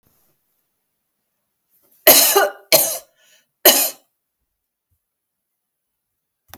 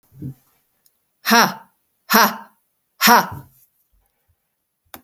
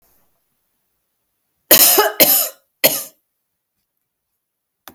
{"three_cough_length": "6.6 s", "three_cough_amplitude": 32768, "three_cough_signal_mean_std_ratio": 0.27, "exhalation_length": "5.0 s", "exhalation_amplitude": 32768, "exhalation_signal_mean_std_ratio": 0.31, "cough_length": "4.9 s", "cough_amplitude": 32768, "cough_signal_mean_std_ratio": 0.31, "survey_phase": "beta (2021-08-13 to 2022-03-07)", "age": "65+", "gender": "Female", "wearing_mask": "No", "symptom_none": true, "smoker_status": "Never smoked", "respiratory_condition_asthma": false, "respiratory_condition_other": false, "recruitment_source": "REACT", "submission_delay": "11 days", "covid_test_result": "Negative", "covid_test_method": "RT-qPCR"}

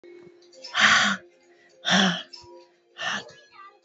{"exhalation_length": "3.8 s", "exhalation_amplitude": 19715, "exhalation_signal_mean_std_ratio": 0.43, "survey_phase": "beta (2021-08-13 to 2022-03-07)", "age": "18-44", "gender": "Female", "wearing_mask": "No", "symptom_shortness_of_breath": true, "symptom_sore_throat": true, "symptom_headache": true, "symptom_change_to_sense_of_smell_or_taste": true, "symptom_onset": "8 days", "smoker_status": "Current smoker (1 to 10 cigarettes per day)", "respiratory_condition_asthma": true, "respiratory_condition_other": false, "recruitment_source": "REACT", "submission_delay": "0 days", "covid_test_result": "Negative", "covid_test_method": "RT-qPCR"}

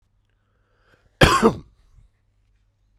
{"cough_length": "3.0 s", "cough_amplitude": 32768, "cough_signal_mean_std_ratio": 0.25, "survey_phase": "beta (2021-08-13 to 2022-03-07)", "age": "18-44", "gender": "Male", "wearing_mask": "No", "symptom_none": true, "smoker_status": "Ex-smoker", "respiratory_condition_asthma": false, "respiratory_condition_other": false, "recruitment_source": "REACT", "submission_delay": "3 days", "covid_test_result": "Negative", "covid_test_method": "RT-qPCR"}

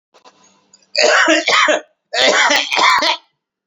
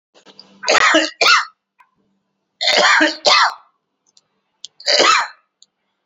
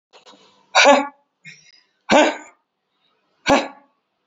{"cough_length": "3.7 s", "cough_amplitude": 32768, "cough_signal_mean_std_ratio": 0.63, "three_cough_length": "6.1 s", "three_cough_amplitude": 32233, "three_cough_signal_mean_std_ratio": 0.46, "exhalation_length": "4.3 s", "exhalation_amplitude": 29411, "exhalation_signal_mean_std_ratio": 0.32, "survey_phase": "beta (2021-08-13 to 2022-03-07)", "age": "18-44", "gender": "Male", "wearing_mask": "No", "symptom_none": true, "smoker_status": "Current smoker (1 to 10 cigarettes per day)", "respiratory_condition_asthma": false, "respiratory_condition_other": false, "recruitment_source": "REACT", "submission_delay": "4 days", "covid_test_result": "Negative", "covid_test_method": "RT-qPCR"}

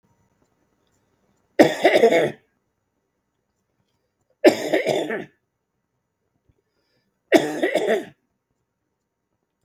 {"three_cough_length": "9.6 s", "three_cough_amplitude": 32768, "three_cough_signal_mean_std_ratio": 0.31, "survey_phase": "beta (2021-08-13 to 2022-03-07)", "age": "65+", "gender": "Male", "wearing_mask": "No", "symptom_none": true, "smoker_status": "Never smoked", "respiratory_condition_asthma": false, "respiratory_condition_other": false, "recruitment_source": "REACT", "submission_delay": "1 day", "covid_test_result": "Negative", "covid_test_method": "RT-qPCR"}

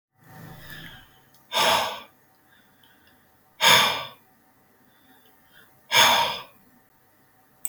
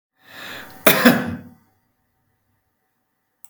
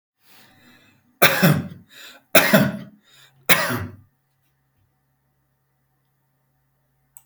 {"exhalation_length": "7.7 s", "exhalation_amplitude": 24235, "exhalation_signal_mean_std_ratio": 0.34, "cough_length": "3.5 s", "cough_amplitude": 32768, "cough_signal_mean_std_ratio": 0.28, "three_cough_length": "7.3 s", "three_cough_amplitude": 32768, "three_cough_signal_mean_std_ratio": 0.3, "survey_phase": "beta (2021-08-13 to 2022-03-07)", "age": "45-64", "gender": "Male", "wearing_mask": "No", "symptom_none": true, "smoker_status": "Never smoked", "respiratory_condition_asthma": true, "respiratory_condition_other": false, "recruitment_source": "REACT", "submission_delay": "4 days", "covid_test_result": "Negative", "covid_test_method": "RT-qPCR", "influenza_a_test_result": "Negative", "influenza_b_test_result": "Negative"}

